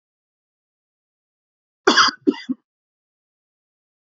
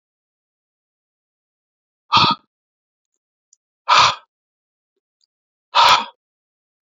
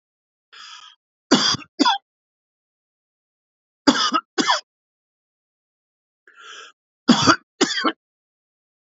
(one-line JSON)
{"cough_length": "4.1 s", "cough_amplitude": 28548, "cough_signal_mean_std_ratio": 0.22, "exhalation_length": "6.8 s", "exhalation_amplitude": 32616, "exhalation_signal_mean_std_ratio": 0.26, "three_cough_length": "9.0 s", "three_cough_amplitude": 32767, "three_cough_signal_mean_std_ratio": 0.31, "survey_phase": "alpha (2021-03-01 to 2021-08-12)", "age": "18-44", "gender": "Male", "wearing_mask": "No", "symptom_none": true, "smoker_status": "Ex-smoker", "respiratory_condition_asthma": false, "respiratory_condition_other": false, "recruitment_source": "REACT", "submission_delay": "3 days", "covid_test_result": "Negative", "covid_test_method": "RT-qPCR"}